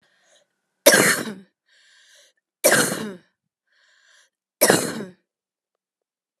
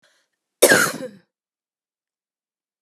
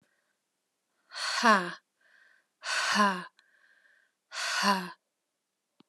{"three_cough_length": "6.4 s", "three_cough_amplitude": 32767, "three_cough_signal_mean_std_ratio": 0.31, "cough_length": "2.8 s", "cough_amplitude": 32625, "cough_signal_mean_std_ratio": 0.26, "exhalation_length": "5.9 s", "exhalation_amplitude": 11780, "exhalation_signal_mean_std_ratio": 0.38, "survey_phase": "alpha (2021-03-01 to 2021-08-12)", "age": "45-64", "gender": "Female", "wearing_mask": "No", "symptom_cough_any": true, "symptom_change_to_sense_of_smell_or_taste": true, "symptom_onset": "7 days", "smoker_status": "Never smoked", "respiratory_condition_asthma": false, "respiratory_condition_other": false, "recruitment_source": "Test and Trace", "submission_delay": "1 day", "covid_test_result": "Positive", "covid_test_method": "RT-qPCR", "covid_ct_value": 25.9, "covid_ct_gene": "ORF1ab gene", "covid_ct_mean": 26.6, "covid_viral_load": "1900 copies/ml", "covid_viral_load_category": "Minimal viral load (< 10K copies/ml)"}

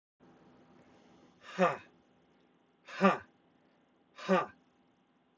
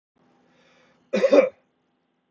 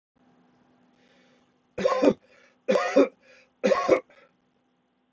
{"exhalation_length": "5.4 s", "exhalation_amplitude": 9726, "exhalation_signal_mean_std_ratio": 0.27, "cough_length": "2.3 s", "cough_amplitude": 21584, "cough_signal_mean_std_ratio": 0.29, "three_cough_length": "5.1 s", "three_cough_amplitude": 16622, "three_cough_signal_mean_std_ratio": 0.35, "survey_phase": "beta (2021-08-13 to 2022-03-07)", "age": "45-64", "gender": "Male", "wearing_mask": "No", "symptom_cough_any": true, "symptom_runny_or_blocked_nose": true, "symptom_diarrhoea": true, "symptom_fatigue": true, "symptom_headache": true, "symptom_onset": "3 days", "smoker_status": "Never smoked", "respiratory_condition_asthma": false, "respiratory_condition_other": false, "recruitment_source": "Test and Trace", "submission_delay": "2 days", "covid_test_result": "Positive", "covid_test_method": "ePCR"}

